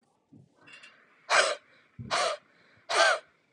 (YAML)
exhalation_length: 3.5 s
exhalation_amplitude: 13236
exhalation_signal_mean_std_ratio: 0.4
survey_phase: beta (2021-08-13 to 2022-03-07)
age: 18-44
gender: Female
wearing_mask: 'No'
symptom_fatigue: true
symptom_onset: 13 days
smoker_status: Never smoked
respiratory_condition_asthma: false
respiratory_condition_other: false
recruitment_source: REACT
submission_delay: 2 days
covid_test_result: Negative
covid_test_method: RT-qPCR
influenza_a_test_result: Negative
influenza_b_test_result: Negative